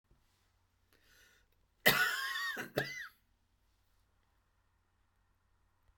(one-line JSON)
{"cough_length": "6.0 s", "cough_amplitude": 8413, "cough_signal_mean_std_ratio": 0.29, "survey_phase": "beta (2021-08-13 to 2022-03-07)", "age": "65+", "gender": "Female", "wearing_mask": "No", "symptom_cough_any": true, "symptom_diarrhoea": true, "symptom_fatigue": true, "symptom_onset": "12 days", "smoker_status": "Ex-smoker", "respiratory_condition_asthma": false, "respiratory_condition_other": false, "recruitment_source": "REACT", "submission_delay": "1 day", "covid_test_result": "Negative", "covid_test_method": "RT-qPCR"}